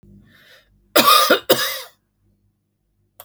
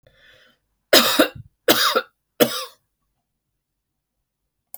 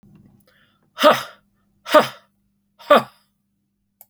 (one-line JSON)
{"cough_length": "3.2 s", "cough_amplitude": 32768, "cough_signal_mean_std_ratio": 0.36, "three_cough_length": "4.8 s", "three_cough_amplitude": 32768, "three_cough_signal_mean_std_ratio": 0.31, "exhalation_length": "4.1 s", "exhalation_amplitude": 29843, "exhalation_signal_mean_std_ratio": 0.26, "survey_phase": "alpha (2021-03-01 to 2021-08-12)", "age": "45-64", "gender": "Female", "wearing_mask": "No", "symptom_none": true, "smoker_status": "Prefer not to say", "respiratory_condition_asthma": true, "respiratory_condition_other": false, "recruitment_source": "REACT", "submission_delay": "1 day", "covid_test_result": "Negative", "covid_test_method": "RT-qPCR"}